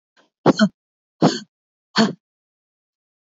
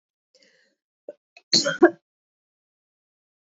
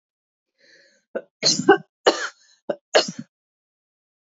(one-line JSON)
{"exhalation_length": "3.3 s", "exhalation_amplitude": 27363, "exhalation_signal_mean_std_ratio": 0.28, "cough_length": "3.5 s", "cough_amplitude": 26004, "cough_signal_mean_std_ratio": 0.2, "three_cough_length": "4.3 s", "three_cough_amplitude": 27194, "three_cough_signal_mean_std_ratio": 0.27, "survey_phase": "beta (2021-08-13 to 2022-03-07)", "age": "18-44", "gender": "Female", "wearing_mask": "No", "symptom_cough_any": true, "smoker_status": "Never smoked", "recruitment_source": "REACT", "submission_delay": "3 days", "covid_test_result": "Negative", "covid_test_method": "RT-qPCR", "influenza_a_test_result": "Negative", "influenza_b_test_result": "Negative"}